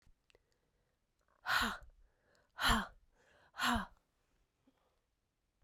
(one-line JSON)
{"exhalation_length": "5.6 s", "exhalation_amplitude": 4003, "exhalation_signal_mean_std_ratio": 0.31, "survey_phase": "beta (2021-08-13 to 2022-03-07)", "age": "45-64", "gender": "Female", "wearing_mask": "No", "symptom_cough_any": true, "symptom_runny_or_blocked_nose": true, "symptom_fatigue": true, "symptom_headache": true, "symptom_change_to_sense_of_smell_or_taste": true, "symptom_loss_of_taste": true, "symptom_onset": "4 days", "smoker_status": "Ex-smoker", "respiratory_condition_asthma": false, "respiratory_condition_other": false, "recruitment_source": "Test and Trace", "submission_delay": "3 days", "covid_test_result": "Positive", "covid_test_method": "LAMP"}